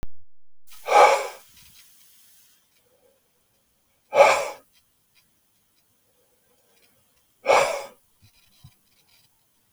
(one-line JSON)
{"exhalation_length": "9.7 s", "exhalation_amplitude": 28133, "exhalation_signal_mean_std_ratio": 0.29, "survey_phase": "beta (2021-08-13 to 2022-03-07)", "age": "65+", "gender": "Male", "wearing_mask": "No", "symptom_none": true, "symptom_onset": "12 days", "smoker_status": "Never smoked", "respiratory_condition_asthma": false, "respiratory_condition_other": false, "recruitment_source": "REACT", "submission_delay": "1 day", "covid_test_result": "Negative", "covid_test_method": "RT-qPCR"}